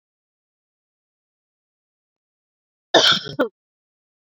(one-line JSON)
{"cough_length": "4.4 s", "cough_amplitude": 28668, "cough_signal_mean_std_ratio": 0.22, "survey_phase": "beta (2021-08-13 to 2022-03-07)", "age": "18-44", "gender": "Female", "wearing_mask": "No", "symptom_runny_or_blocked_nose": true, "symptom_sore_throat": true, "symptom_abdominal_pain": true, "symptom_fatigue": true, "symptom_onset": "12 days", "smoker_status": "Ex-smoker", "respiratory_condition_asthma": false, "respiratory_condition_other": false, "recruitment_source": "REACT", "submission_delay": "1 day", "covid_test_result": "Negative", "covid_test_method": "RT-qPCR"}